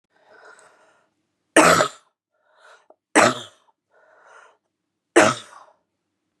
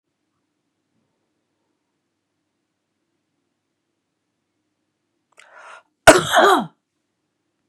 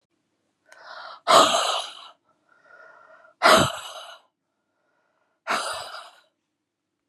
{"three_cough_length": "6.4 s", "three_cough_amplitude": 31974, "three_cough_signal_mean_std_ratio": 0.26, "cough_length": "7.7 s", "cough_amplitude": 32768, "cough_signal_mean_std_ratio": 0.19, "exhalation_length": "7.1 s", "exhalation_amplitude": 28376, "exhalation_signal_mean_std_ratio": 0.32, "survey_phase": "beta (2021-08-13 to 2022-03-07)", "age": "45-64", "gender": "Female", "wearing_mask": "No", "symptom_cough_any": true, "symptom_runny_or_blocked_nose": true, "symptom_fatigue": true, "smoker_status": "Ex-smoker", "respiratory_condition_asthma": false, "respiratory_condition_other": false, "recruitment_source": "Test and Trace", "submission_delay": "2 days", "covid_test_result": "Positive", "covid_test_method": "LFT"}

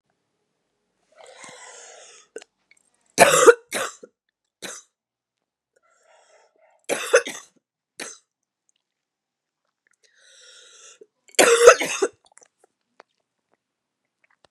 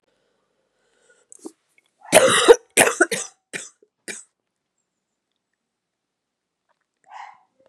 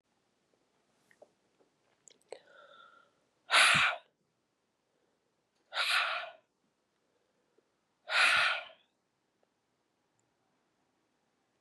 {"three_cough_length": "14.5 s", "three_cough_amplitude": 32768, "three_cough_signal_mean_std_ratio": 0.22, "cough_length": "7.7 s", "cough_amplitude": 32768, "cough_signal_mean_std_ratio": 0.23, "exhalation_length": "11.6 s", "exhalation_amplitude": 9022, "exhalation_signal_mean_std_ratio": 0.28, "survey_phase": "beta (2021-08-13 to 2022-03-07)", "age": "45-64", "gender": "Female", "wearing_mask": "No", "symptom_cough_any": true, "symptom_new_continuous_cough": true, "symptom_runny_or_blocked_nose": true, "symptom_sore_throat": true, "symptom_diarrhoea": true, "symptom_fatigue": true, "symptom_fever_high_temperature": true, "symptom_headache": true, "symptom_change_to_sense_of_smell_or_taste": true, "symptom_other": true, "smoker_status": "Ex-smoker", "respiratory_condition_asthma": false, "respiratory_condition_other": false, "recruitment_source": "Test and Trace", "submission_delay": "1 day", "covid_test_result": "Positive", "covid_test_method": "ePCR"}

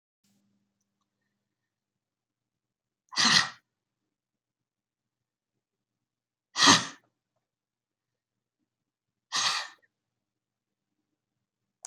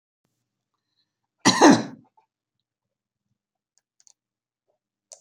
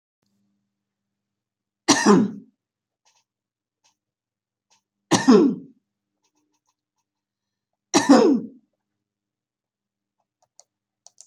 {"exhalation_length": "11.9 s", "exhalation_amplitude": 17607, "exhalation_signal_mean_std_ratio": 0.19, "cough_length": "5.2 s", "cough_amplitude": 27911, "cough_signal_mean_std_ratio": 0.19, "three_cough_length": "11.3 s", "three_cough_amplitude": 26255, "three_cough_signal_mean_std_ratio": 0.26, "survey_phase": "beta (2021-08-13 to 2022-03-07)", "age": "65+", "gender": "Female", "wearing_mask": "No", "symptom_none": true, "smoker_status": "Ex-smoker", "respiratory_condition_asthma": false, "respiratory_condition_other": false, "recruitment_source": "REACT", "submission_delay": "1 day", "covid_test_result": "Negative", "covid_test_method": "RT-qPCR"}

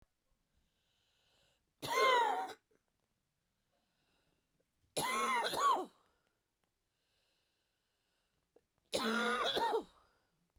{"three_cough_length": "10.6 s", "three_cough_amplitude": 3336, "three_cough_signal_mean_std_ratio": 0.4, "survey_phase": "beta (2021-08-13 to 2022-03-07)", "age": "45-64", "gender": "Female", "wearing_mask": "No", "symptom_cough_any": true, "symptom_fatigue": true, "symptom_fever_high_temperature": true, "symptom_onset": "3 days", "smoker_status": "Ex-smoker", "respiratory_condition_asthma": false, "respiratory_condition_other": false, "recruitment_source": "Test and Trace", "submission_delay": "2 days", "covid_test_result": "Positive", "covid_test_method": "RT-qPCR"}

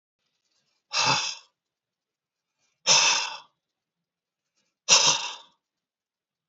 {"exhalation_length": "6.5 s", "exhalation_amplitude": 22506, "exhalation_signal_mean_std_ratio": 0.33, "survey_phase": "beta (2021-08-13 to 2022-03-07)", "age": "65+", "gender": "Male", "wearing_mask": "No", "symptom_runny_or_blocked_nose": true, "smoker_status": "Ex-smoker", "respiratory_condition_asthma": false, "respiratory_condition_other": false, "recruitment_source": "REACT", "submission_delay": "1 day", "covid_test_result": "Negative", "covid_test_method": "RT-qPCR", "influenza_a_test_result": "Negative", "influenza_b_test_result": "Negative"}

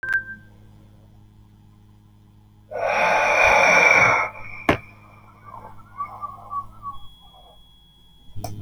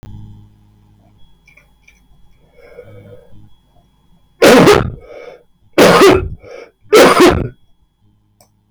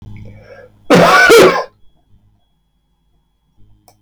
{"exhalation_length": "8.6 s", "exhalation_amplitude": 23105, "exhalation_signal_mean_std_ratio": 0.46, "three_cough_length": "8.7 s", "three_cough_amplitude": 32768, "three_cough_signal_mean_std_ratio": 0.39, "cough_length": "4.0 s", "cough_amplitude": 32768, "cough_signal_mean_std_ratio": 0.41, "survey_phase": "beta (2021-08-13 to 2022-03-07)", "age": "65+", "gender": "Male", "wearing_mask": "No", "symptom_none": true, "smoker_status": "Never smoked", "respiratory_condition_asthma": false, "respiratory_condition_other": false, "recruitment_source": "REACT", "submission_delay": "1 day", "covid_test_result": "Negative", "covid_test_method": "RT-qPCR"}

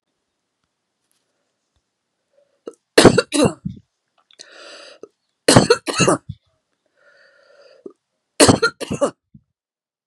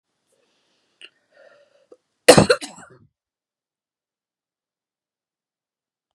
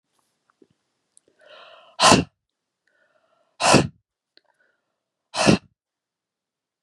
{"three_cough_length": "10.1 s", "three_cough_amplitude": 32768, "three_cough_signal_mean_std_ratio": 0.27, "cough_length": "6.1 s", "cough_amplitude": 32768, "cough_signal_mean_std_ratio": 0.15, "exhalation_length": "6.8 s", "exhalation_amplitude": 32768, "exhalation_signal_mean_std_ratio": 0.24, "survey_phase": "beta (2021-08-13 to 2022-03-07)", "age": "65+", "gender": "Female", "wearing_mask": "No", "symptom_none": true, "smoker_status": "Never smoked", "respiratory_condition_asthma": false, "respiratory_condition_other": false, "recruitment_source": "REACT", "submission_delay": "1 day", "covid_test_result": "Negative", "covid_test_method": "RT-qPCR", "influenza_a_test_result": "Negative", "influenza_b_test_result": "Negative"}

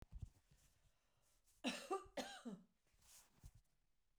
{"cough_length": "4.2 s", "cough_amplitude": 1001, "cough_signal_mean_std_ratio": 0.38, "survey_phase": "beta (2021-08-13 to 2022-03-07)", "age": "45-64", "gender": "Female", "wearing_mask": "No", "symptom_cough_any": true, "symptom_onset": "12 days", "smoker_status": "Ex-smoker", "respiratory_condition_asthma": false, "respiratory_condition_other": false, "recruitment_source": "REACT", "submission_delay": "1 day", "covid_test_result": "Negative", "covid_test_method": "RT-qPCR"}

